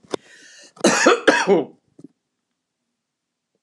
{"cough_length": "3.6 s", "cough_amplitude": 29204, "cough_signal_mean_std_ratio": 0.36, "survey_phase": "alpha (2021-03-01 to 2021-08-12)", "age": "45-64", "gender": "Female", "wearing_mask": "No", "symptom_none": true, "smoker_status": "Current smoker (11 or more cigarettes per day)", "respiratory_condition_asthma": false, "respiratory_condition_other": false, "recruitment_source": "REACT", "submission_delay": "1 day", "covid_test_result": "Negative", "covid_test_method": "RT-qPCR"}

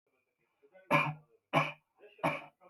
{"three_cough_length": "2.7 s", "three_cough_amplitude": 7805, "three_cough_signal_mean_std_ratio": 0.36, "survey_phase": "beta (2021-08-13 to 2022-03-07)", "age": "45-64", "gender": "Male", "wearing_mask": "No", "symptom_none": true, "smoker_status": "Current smoker (e-cigarettes or vapes only)", "respiratory_condition_asthma": false, "respiratory_condition_other": false, "recruitment_source": "REACT", "submission_delay": "10 days", "covid_test_result": "Negative", "covid_test_method": "RT-qPCR", "influenza_a_test_result": "Unknown/Void", "influenza_b_test_result": "Unknown/Void"}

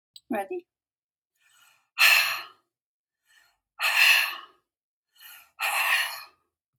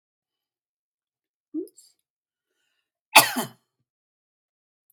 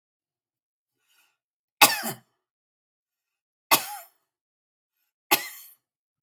{"exhalation_length": "6.8 s", "exhalation_amplitude": 15886, "exhalation_signal_mean_std_ratio": 0.39, "cough_length": "4.9 s", "cough_amplitude": 32767, "cough_signal_mean_std_ratio": 0.15, "three_cough_length": "6.2 s", "three_cough_amplitude": 32767, "three_cough_signal_mean_std_ratio": 0.19, "survey_phase": "beta (2021-08-13 to 2022-03-07)", "age": "65+", "gender": "Female", "wearing_mask": "No", "symptom_none": true, "smoker_status": "Never smoked", "respiratory_condition_asthma": false, "respiratory_condition_other": false, "recruitment_source": "REACT", "submission_delay": "2 days", "covid_test_result": "Negative", "covid_test_method": "RT-qPCR", "influenza_a_test_result": "Negative", "influenza_b_test_result": "Negative"}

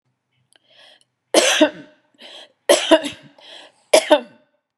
{"three_cough_length": "4.8 s", "three_cough_amplitude": 32767, "three_cough_signal_mean_std_ratio": 0.33, "survey_phase": "beta (2021-08-13 to 2022-03-07)", "age": "65+", "gender": "Female", "wearing_mask": "No", "symptom_none": true, "smoker_status": "Never smoked", "respiratory_condition_asthma": false, "respiratory_condition_other": false, "recruitment_source": "REACT", "submission_delay": "1 day", "covid_test_result": "Negative", "covid_test_method": "RT-qPCR", "influenza_a_test_result": "Negative", "influenza_b_test_result": "Negative"}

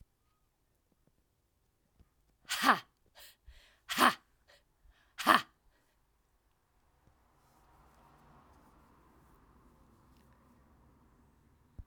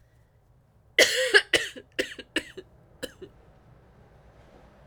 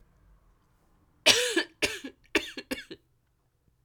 {"exhalation_length": "11.9 s", "exhalation_amplitude": 16354, "exhalation_signal_mean_std_ratio": 0.19, "cough_length": "4.9 s", "cough_amplitude": 22985, "cough_signal_mean_std_ratio": 0.29, "three_cough_length": "3.8 s", "three_cough_amplitude": 21949, "three_cough_signal_mean_std_ratio": 0.31, "survey_phase": "alpha (2021-03-01 to 2021-08-12)", "age": "45-64", "gender": "Female", "wearing_mask": "No", "symptom_cough_any": true, "symptom_fatigue": true, "symptom_fever_high_temperature": true, "symptom_headache": true, "symptom_onset": "6 days", "smoker_status": "Ex-smoker", "respiratory_condition_asthma": false, "respiratory_condition_other": false, "recruitment_source": "Test and Trace", "submission_delay": "2 days", "covid_test_result": "Positive", "covid_test_method": "RT-qPCR"}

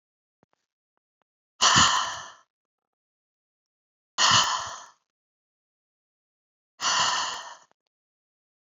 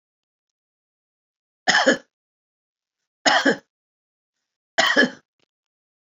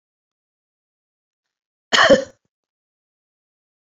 {"exhalation_length": "8.8 s", "exhalation_amplitude": 20625, "exhalation_signal_mean_std_ratio": 0.33, "three_cough_length": "6.1 s", "three_cough_amplitude": 23210, "three_cough_signal_mean_std_ratio": 0.29, "cough_length": "3.8 s", "cough_amplitude": 30469, "cough_signal_mean_std_ratio": 0.21, "survey_phase": "beta (2021-08-13 to 2022-03-07)", "age": "45-64", "gender": "Female", "wearing_mask": "No", "symptom_runny_or_blocked_nose": true, "smoker_status": "Current smoker (11 or more cigarettes per day)", "respiratory_condition_asthma": false, "respiratory_condition_other": false, "recruitment_source": "REACT", "submission_delay": "1 day", "covid_test_result": "Negative", "covid_test_method": "RT-qPCR"}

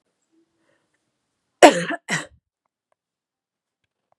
{"cough_length": "4.2 s", "cough_amplitude": 32768, "cough_signal_mean_std_ratio": 0.17, "survey_phase": "beta (2021-08-13 to 2022-03-07)", "age": "18-44", "gender": "Female", "wearing_mask": "No", "symptom_runny_or_blocked_nose": true, "symptom_fatigue": true, "symptom_headache": true, "smoker_status": "Never smoked", "respiratory_condition_asthma": false, "respiratory_condition_other": false, "recruitment_source": "Test and Trace", "submission_delay": "2 days", "covid_test_result": "Positive", "covid_test_method": "RT-qPCR", "covid_ct_value": 24.2, "covid_ct_gene": "N gene", "covid_ct_mean": 24.5, "covid_viral_load": "9400 copies/ml", "covid_viral_load_category": "Minimal viral load (< 10K copies/ml)"}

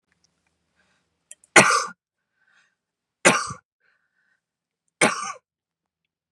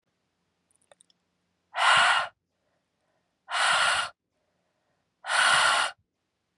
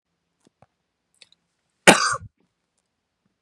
{"three_cough_length": "6.3 s", "three_cough_amplitude": 32768, "three_cough_signal_mean_std_ratio": 0.23, "exhalation_length": "6.6 s", "exhalation_amplitude": 11785, "exhalation_signal_mean_std_ratio": 0.42, "cough_length": "3.4 s", "cough_amplitude": 32768, "cough_signal_mean_std_ratio": 0.18, "survey_phase": "beta (2021-08-13 to 2022-03-07)", "age": "18-44", "gender": "Female", "wearing_mask": "No", "symptom_runny_or_blocked_nose": true, "symptom_fatigue": true, "smoker_status": "Current smoker (1 to 10 cigarettes per day)", "respiratory_condition_asthma": false, "respiratory_condition_other": false, "recruitment_source": "Test and Trace", "submission_delay": "2 days", "covid_test_result": "Positive", "covid_test_method": "RT-qPCR", "covid_ct_value": 15.0, "covid_ct_gene": "S gene", "covid_ct_mean": 15.4, "covid_viral_load": "8600000 copies/ml", "covid_viral_load_category": "High viral load (>1M copies/ml)"}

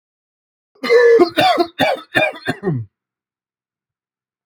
{"cough_length": "4.5 s", "cough_amplitude": 27921, "cough_signal_mean_std_ratio": 0.46, "survey_phase": "alpha (2021-03-01 to 2021-08-12)", "age": "18-44", "gender": "Male", "wearing_mask": "No", "symptom_cough_any": true, "smoker_status": "Ex-smoker", "respiratory_condition_asthma": false, "respiratory_condition_other": false, "recruitment_source": "REACT", "submission_delay": "2 days", "covid_test_result": "Negative", "covid_test_method": "RT-qPCR"}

